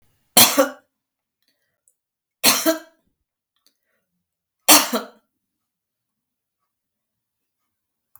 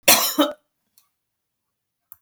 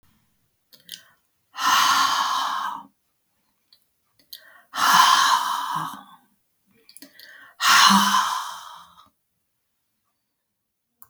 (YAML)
three_cough_length: 8.2 s
three_cough_amplitude: 32768
three_cough_signal_mean_std_ratio: 0.23
cough_length: 2.2 s
cough_amplitude: 32768
cough_signal_mean_std_ratio: 0.3
exhalation_length: 11.1 s
exhalation_amplitude: 25164
exhalation_signal_mean_std_ratio: 0.43
survey_phase: beta (2021-08-13 to 2022-03-07)
age: 65+
gender: Female
wearing_mask: 'No'
symptom_cough_any: true
symptom_other: true
symptom_onset: 12 days
smoker_status: Never smoked
respiratory_condition_asthma: false
respiratory_condition_other: false
recruitment_source: REACT
submission_delay: 3 days
covid_test_result: Negative
covid_test_method: RT-qPCR
influenza_a_test_result: Negative
influenza_b_test_result: Negative